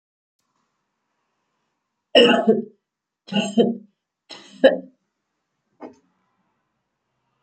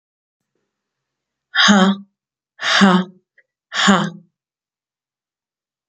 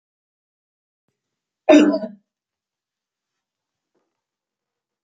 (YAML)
three_cough_length: 7.4 s
three_cough_amplitude: 30664
three_cough_signal_mean_std_ratio: 0.27
exhalation_length: 5.9 s
exhalation_amplitude: 32767
exhalation_signal_mean_std_ratio: 0.36
cough_length: 5.0 s
cough_amplitude: 28246
cough_signal_mean_std_ratio: 0.2
survey_phase: beta (2021-08-13 to 2022-03-07)
age: 45-64
gender: Female
wearing_mask: 'No'
symptom_runny_or_blocked_nose: true
symptom_onset: 12 days
smoker_status: Never smoked
respiratory_condition_asthma: true
respiratory_condition_other: false
recruitment_source: REACT
submission_delay: 3 days
covid_test_result: Negative
covid_test_method: RT-qPCR